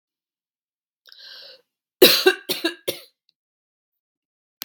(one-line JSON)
{"three_cough_length": "4.6 s", "three_cough_amplitude": 32768, "three_cough_signal_mean_std_ratio": 0.23, "survey_phase": "beta (2021-08-13 to 2022-03-07)", "age": "45-64", "gender": "Female", "wearing_mask": "No", "symptom_none": true, "smoker_status": "Never smoked", "respiratory_condition_asthma": false, "respiratory_condition_other": false, "recruitment_source": "REACT", "submission_delay": "1 day", "covid_test_result": "Negative", "covid_test_method": "RT-qPCR"}